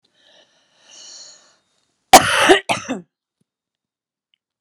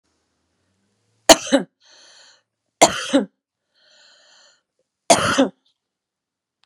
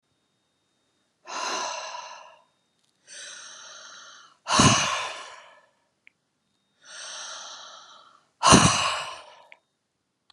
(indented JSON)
{
  "cough_length": "4.6 s",
  "cough_amplitude": 32768,
  "cough_signal_mean_std_ratio": 0.25,
  "three_cough_length": "6.7 s",
  "three_cough_amplitude": 32768,
  "three_cough_signal_mean_std_ratio": 0.25,
  "exhalation_length": "10.3 s",
  "exhalation_amplitude": 31488,
  "exhalation_signal_mean_std_ratio": 0.33,
  "survey_phase": "beta (2021-08-13 to 2022-03-07)",
  "age": "45-64",
  "gender": "Female",
  "wearing_mask": "No",
  "symptom_none": true,
  "smoker_status": "Ex-smoker",
  "respiratory_condition_asthma": true,
  "respiratory_condition_other": false,
  "recruitment_source": "Test and Trace",
  "submission_delay": "2 days",
  "covid_test_result": "Positive",
  "covid_test_method": "RT-qPCR",
  "covid_ct_value": 28.0,
  "covid_ct_gene": "ORF1ab gene",
  "covid_ct_mean": 28.6,
  "covid_viral_load": "400 copies/ml",
  "covid_viral_load_category": "Minimal viral load (< 10K copies/ml)"
}